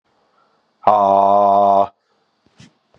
{"exhalation_length": "3.0 s", "exhalation_amplitude": 32768, "exhalation_signal_mean_std_ratio": 0.49, "survey_phase": "beta (2021-08-13 to 2022-03-07)", "age": "45-64", "gender": "Male", "wearing_mask": "No", "symptom_cough_any": true, "symptom_runny_or_blocked_nose": true, "symptom_sore_throat": true, "symptom_abdominal_pain": true, "symptom_fatigue": true, "symptom_headache": true, "symptom_onset": "3 days", "smoker_status": "Never smoked", "respiratory_condition_asthma": false, "respiratory_condition_other": false, "recruitment_source": "Test and Trace", "submission_delay": "2 days", "covid_test_result": "Positive", "covid_test_method": "RT-qPCR", "covid_ct_value": 11.9, "covid_ct_gene": "N gene", "covid_ct_mean": 12.4, "covid_viral_load": "85000000 copies/ml", "covid_viral_load_category": "High viral load (>1M copies/ml)"}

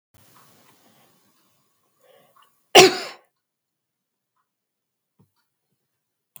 {"cough_length": "6.4 s", "cough_amplitude": 32767, "cough_signal_mean_std_ratio": 0.14, "survey_phase": "beta (2021-08-13 to 2022-03-07)", "age": "65+", "gender": "Female", "wearing_mask": "No", "symptom_none": true, "smoker_status": "Ex-smoker", "respiratory_condition_asthma": false, "respiratory_condition_other": false, "recruitment_source": "REACT", "submission_delay": "2 days", "covid_test_result": "Negative", "covid_test_method": "RT-qPCR", "influenza_a_test_result": "Negative", "influenza_b_test_result": "Negative"}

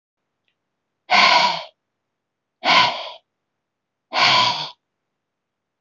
{"exhalation_length": "5.8 s", "exhalation_amplitude": 24691, "exhalation_signal_mean_std_ratio": 0.39, "survey_phase": "beta (2021-08-13 to 2022-03-07)", "age": "45-64", "gender": "Female", "wearing_mask": "No", "symptom_none": true, "smoker_status": "Never smoked", "respiratory_condition_asthma": false, "respiratory_condition_other": false, "recruitment_source": "REACT", "submission_delay": "1 day", "covid_test_result": "Negative", "covid_test_method": "RT-qPCR", "influenza_a_test_result": "Negative", "influenza_b_test_result": "Negative"}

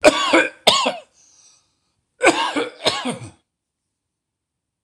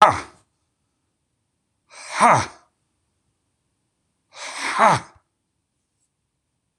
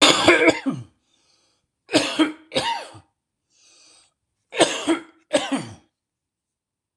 {"cough_length": "4.8 s", "cough_amplitude": 26028, "cough_signal_mean_std_ratio": 0.39, "exhalation_length": "6.8 s", "exhalation_amplitude": 26028, "exhalation_signal_mean_std_ratio": 0.26, "three_cough_length": "7.0 s", "three_cough_amplitude": 26028, "three_cough_signal_mean_std_ratio": 0.39, "survey_phase": "beta (2021-08-13 to 2022-03-07)", "age": "45-64", "gender": "Male", "wearing_mask": "No", "symptom_cough_any": true, "symptom_runny_or_blocked_nose": true, "symptom_sore_throat": true, "symptom_onset": "4 days", "smoker_status": "Ex-smoker", "respiratory_condition_asthma": false, "respiratory_condition_other": false, "recruitment_source": "REACT", "submission_delay": "1 day", "covid_test_result": "Negative", "covid_test_method": "RT-qPCR"}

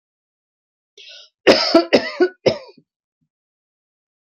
{"three_cough_length": "4.3 s", "three_cough_amplitude": 29441, "three_cough_signal_mean_std_ratio": 0.3, "survey_phase": "alpha (2021-03-01 to 2021-08-12)", "age": "45-64", "gender": "Female", "wearing_mask": "No", "symptom_none": true, "smoker_status": "Never smoked", "respiratory_condition_asthma": false, "respiratory_condition_other": false, "recruitment_source": "REACT", "submission_delay": "2 days", "covid_test_result": "Negative", "covid_test_method": "RT-qPCR"}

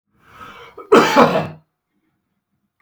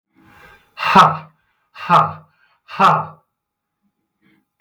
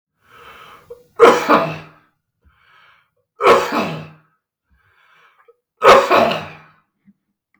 {"cough_length": "2.8 s", "cough_amplitude": 32768, "cough_signal_mean_std_ratio": 0.35, "exhalation_length": "4.6 s", "exhalation_amplitude": 32768, "exhalation_signal_mean_std_ratio": 0.34, "three_cough_length": "7.6 s", "three_cough_amplitude": 32768, "three_cough_signal_mean_std_ratio": 0.35, "survey_phase": "beta (2021-08-13 to 2022-03-07)", "age": "45-64", "gender": "Male", "wearing_mask": "No", "symptom_none": true, "smoker_status": "Never smoked", "respiratory_condition_asthma": false, "respiratory_condition_other": false, "recruitment_source": "REACT", "submission_delay": "3 days", "covid_test_result": "Negative", "covid_test_method": "RT-qPCR", "influenza_a_test_result": "Negative", "influenza_b_test_result": "Negative"}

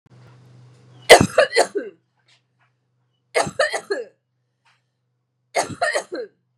{"three_cough_length": "6.6 s", "three_cough_amplitude": 32768, "three_cough_signal_mean_std_ratio": 0.29, "survey_phase": "beta (2021-08-13 to 2022-03-07)", "age": "18-44", "gender": "Female", "wearing_mask": "No", "symptom_runny_or_blocked_nose": true, "symptom_fatigue": true, "smoker_status": "Ex-smoker", "respiratory_condition_asthma": false, "respiratory_condition_other": false, "recruitment_source": "REACT", "submission_delay": "1 day", "covid_test_result": "Negative", "covid_test_method": "RT-qPCR", "influenza_a_test_result": "Negative", "influenza_b_test_result": "Negative"}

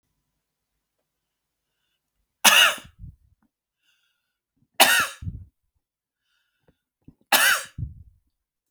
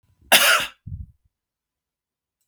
{"three_cough_length": "8.7 s", "three_cough_amplitude": 32768, "three_cough_signal_mean_std_ratio": 0.26, "cough_length": "2.5 s", "cough_amplitude": 32768, "cough_signal_mean_std_ratio": 0.3, "survey_phase": "beta (2021-08-13 to 2022-03-07)", "age": "45-64", "gender": "Male", "wearing_mask": "No", "symptom_none": true, "smoker_status": "Ex-smoker", "respiratory_condition_asthma": false, "respiratory_condition_other": false, "recruitment_source": "REACT", "submission_delay": "7 days", "covid_test_result": "Negative", "covid_test_method": "RT-qPCR"}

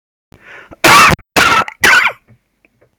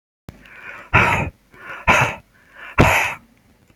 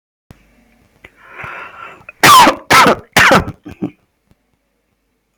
{"cough_length": "3.0 s", "cough_amplitude": 32768, "cough_signal_mean_std_ratio": 0.51, "exhalation_length": "3.8 s", "exhalation_amplitude": 32373, "exhalation_signal_mean_std_ratio": 0.44, "three_cough_length": "5.4 s", "three_cough_amplitude": 32768, "three_cough_signal_mean_std_ratio": 0.39, "survey_phase": "beta (2021-08-13 to 2022-03-07)", "age": "65+", "gender": "Female", "wearing_mask": "No", "symptom_runny_or_blocked_nose": true, "symptom_fatigue": true, "symptom_onset": "2 days", "smoker_status": "Never smoked", "respiratory_condition_asthma": false, "respiratory_condition_other": false, "recruitment_source": "REACT", "submission_delay": "2 days", "covid_test_result": "Negative", "covid_test_method": "RT-qPCR", "influenza_a_test_result": "Negative", "influenza_b_test_result": "Negative"}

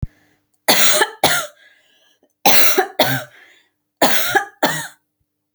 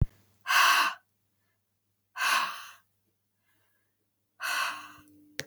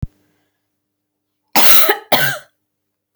{"three_cough_length": "5.5 s", "three_cough_amplitude": 32768, "three_cough_signal_mean_std_ratio": 0.46, "exhalation_length": "5.5 s", "exhalation_amplitude": 10657, "exhalation_signal_mean_std_ratio": 0.37, "cough_length": "3.2 s", "cough_amplitude": 32768, "cough_signal_mean_std_ratio": 0.36, "survey_phase": "beta (2021-08-13 to 2022-03-07)", "age": "18-44", "gender": "Female", "wearing_mask": "No", "symptom_none": true, "smoker_status": "Never smoked", "respiratory_condition_asthma": false, "respiratory_condition_other": false, "recruitment_source": "REACT", "submission_delay": "7 days", "covid_test_result": "Negative", "covid_test_method": "RT-qPCR", "influenza_a_test_result": "Negative", "influenza_b_test_result": "Negative"}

